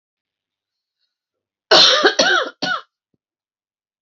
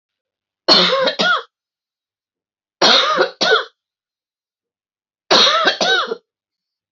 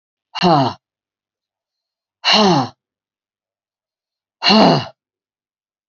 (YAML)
cough_length: 4.0 s
cough_amplitude: 31159
cough_signal_mean_std_ratio: 0.36
three_cough_length: 6.9 s
three_cough_amplitude: 32768
three_cough_signal_mean_std_ratio: 0.46
exhalation_length: 5.9 s
exhalation_amplitude: 30298
exhalation_signal_mean_std_ratio: 0.36
survey_phase: alpha (2021-03-01 to 2021-08-12)
age: 45-64
gender: Female
wearing_mask: 'No'
symptom_cough_any: true
symptom_headache: true
symptom_change_to_sense_of_smell_or_taste: true
symptom_loss_of_taste: true
symptom_onset: 4 days
smoker_status: Never smoked
respiratory_condition_asthma: true
respiratory_condition_other: false
recruitment_source: Test and Trace
submission_delay: 2 days
covid_test_result: Positive
covid_test_method: RT-qPCR
covid_ct_value: 17.0
covid_ct_gene: N gene
covid_ct_mean: 18.2
covid_viral_load: 1000000 copies/ml
covid_viral_load_category: High viral load (>1M copies/ml)